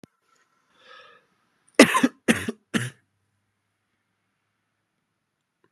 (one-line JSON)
{"three_cough_length": "5.7 s", "three_cough_amplitude": 32729, "three_cough_signal_mean_std_ratio": 0.2, "survey_phase": "beta (2021-08-13 to 2022-03-07)", "age": "18-44", "gender": "Male", "wearing_mask": "No", "symptom_headache": true, "smoker_status": "Never smoked", "respiratory_condition_asthma": false, "respiratory_condition_other": false, "recruitment_source": "Test and Trace", "submission_delay": "2 days", "covid_test_result": "Positive", "covid_test_method": "RT-qPCR", "covid_ct_value": 29.2, "covid_ct_gene": "ORF1ab gene"}